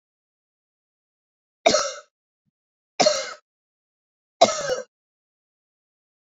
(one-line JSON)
{"three_cough_length": "6.2 s", "three_cough_amplitude": 27305, "three_cough_signal_mean_std_ratio": 0.25, "survey_phase": "beta (2021-08-13 to 2022-03-07)", "age": "45-64", "gender": "Female", "wearing_mask": "No", "symptom_none": true, "smoker_status": "Never smoked", "respiratory_condition_asthma": false, "respiratory_condition_other": false, "recruitment_source": "REACT", "submission_delay": "1 day", "covid_test_result": "Negative", "covid_test_method": "RT-qPCR"}